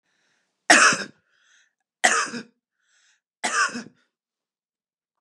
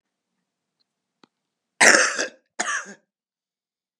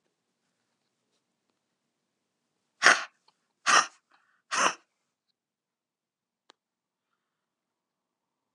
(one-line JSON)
{"three_cough_length": "5.2 s", "three_cough_amplitude": 31558, "three_cough_signal_mean_std_ratio": 0.3, "cough_length": "4.0 s", "cough_amplitude": 32768, "cough_signal_mean_std_ratio": 0.27, "exhalation_length": "8.5 s", "exhalation_amplitude": 30398, "exhalation_signal_mean_std_ratio": 0.18, "survey_phase": "beta (2021-08-13 to 2022-03-07)", "age": "45-64", "gender": "Female", "wearing_mask": "No", "symptom_none": true, "smoker_status": "Current smoker (11 or more cigarettes per day)", "respiratory_condition_asthma": false, "respiratory_condition_other": false, "recruitment_source": "REACT", "submission_delay": "1 day", "covid_test_result": "Negative", "covid_test_method": "RT-qPCR", "influenza_a_test_result": "Negative", "influenza_b_test_result": "Negative"}